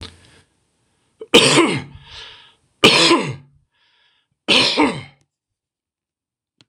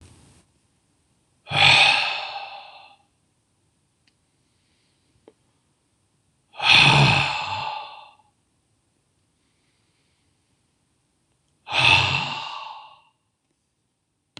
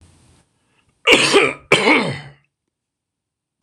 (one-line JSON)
{"three_cough_length": "6.7 s", "three_cough_amplitude": 26028, "three_cough_signal_mean_std_ratio": 0.37, "exhalation_length": "14.4 s", "exhalation_amplitude": 25958, "exhalation_signal_mean_std_ratio": 0.33, "cough_length": "3.6 s", "cough_amplitude": 26028, "cough_signal_mean_std_ratio": 0.39, "survey_phase": "beta (2021-08-13 to 2022-03-07)", "age": "65+", "gender": "Male", "wearing_mask": "No", "symptom_none": true, "smoker_status": "Ex-smoker", "respiratory_condition_asthma": false, "respiratory_condition_other": false, "recruitment_source": "REACT", "submission_delay": "1 day", "covid_test_result": "Negative", "covid_test_method": "RT-qPCR", "influenza_a_test_result": "Negative", "influenza_b_test_result": "Negative"}